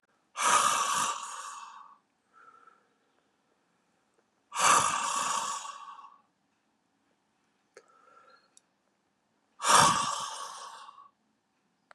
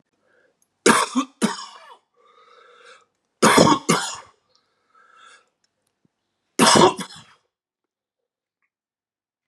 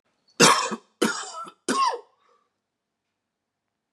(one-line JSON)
{"exhalation_length": "11.9 s", "exhalation_amplitude": 14545, "exhalation_signal_mean_std_ratio": 0.38, "three_cough_length": "9.5 s", "three_cough_amplitude": 32764, "three_cough_signal_mean_std_ratio": 0.3, "cough_length": "3.9 s", "cough_amplitude": 29316, "cough_signal_mean_std_ratio": 0.35, "survey_phase": "beta (2021-08-13 to 2022-03-07)", "age": "65+", "gender": "Male", "wearing_mask": "No", "symptom_cough_any": true, "symptom_runny_or_blocked_nose": true, "symptom_sore_throat": true, "symptom_headache": true, "symptom_change_to_sense_of_smell_or_taste": true, "symptom_loss_of_taste": true, "smoker_status": "Never smoked", "respiratory_condition_asthma": false, "respiratory_condition_other": false, "recruitment_source": "Test and Trace", "submission_delay": "1 day", "covid_test_result": "Positive", "covid_test_method": "RT-qPCR"}